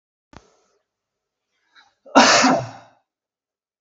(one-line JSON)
{"cough_length": "3.8 s", "cough_amplitude": 32768, "cough_signal_mean_std_ratio": 0.29, "survey_phase": "beta (2021-08-13 to 2022-03-07)", "age": "45-64", "gender": "Male", "wearing_mask": "No", "symptom_none": true, "smoker_status": "Ex-smoker", "respiratory_condition_asthma": true, "respiratory_condition_other": false, "recruitment_source": "Test and Trace", "submission_delay": "1 day", "covid_test_result": "Negative", "covid_test_method": "ePCR"}